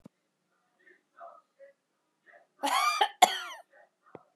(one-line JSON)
{"cough_length": "4.4 s", "cough_amplitude": 18719, "cough_signal_mean_std_ratio": 0.28, "survey_phase": "beta (2021-08-13 to 2022-03-07)", "age": "45-64", "gender": "Female", "wearing_mask": "No", "symptom_runny_or_blocked_nose": true, "symptom_fatigue": true, "smoker_status": "Never smoked", "respiratory_condition_asthma": false, "respiratory_condition_other": false, "recruitment_source": "REACT", "submission_delay": "1 day", "covid_test_result": "Negative", "covid_test_method": "RT-qPCR", "influenza_a_test_result": "Negative", "influenza_b_test_result": "Negative"}